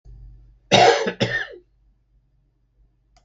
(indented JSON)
{
  "cough_length": "3.2 s",
  "cough_amplitude": 32766,
  "cough_signal_mean_std_ratio": 0.34,
  "survey_phase": "beta (2021-08-13 to 2022-03-07)",
  "age": "65+",
  "gender": "Male",
  "wearing_mask": "No",
  "symptom_none": true,
  "smoker_status": "Ex-smoker",
  "respiratory_condition_asthma": false,
  "respiratory_condition_other": true,
  "recruitment_source": "REACT",
  "submission_delay": "4 days",
  "covid_test_result": "Negative",
  "covid_test_method": "RT-qPCR",
  "influenza_a_test_result": "Negative",
  "influenza_b_test_result": "Negative"
}